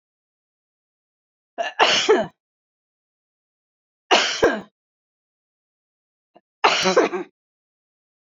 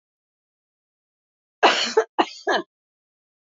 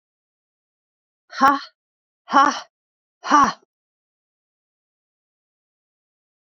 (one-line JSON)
{"three_cough_length": "8.3 s", "three_cough_amplitude": 28283, "three_cough_signal_mean_std_ratio": 0.32, "cough_length": "3.6 s", "cough_amplitude": 26033, "cough_signal_mean_std_ratio": 0.29, "exhalation_length": "6.6 s", "exhalation_amplitude": 27548, "exhalation_signal_mean_std_ratio": 0.24, "survey_phase": "beta (2021-08-13 to 2022-03-07)", "age": "65+", "gender": "Female", "wearing_mask": "No", "symptom_none": true, "smoker_status": "Never smoked", "respiratory_condition_asthma": false, "respiratory_condition_other": false, "recruitment_source": "REACT", "submission_delay": "3 days", "covid_test_result": "Negative", "covid_test_method": "RT-qPCR"}